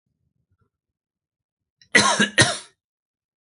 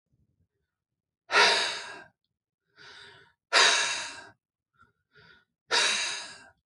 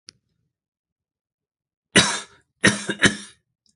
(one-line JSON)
{"cough_length": "3.5 s", "cough_amplitude": 29497, "cough_signal_mean_std_ratio": 0.28, "exhalation_length": "6.7 s", "exhalation_amplitude": 15248, "exhalation_signal_mean_std_ratio": 0.38, "three_cough_length": "3.8 s", "three_cough_amplitude": 30634, "three_cough_signal_mean_std_ratio": 0.27, "survey_phase": "alpha (2021-03-01 to 2021-08-12)", "age": "18-44", "gender": "Male", "wearing_mask": "No", "symptom_none": true, "smoker_status": "Never smoked", "respiratory_condition_asthma": false, "respiratory_condition_other": false, "recruitment_source": "REACT", "submission_delay": "2 days", "covid_test_result": "Negative", "covid_test_method": "RT-qPCR"}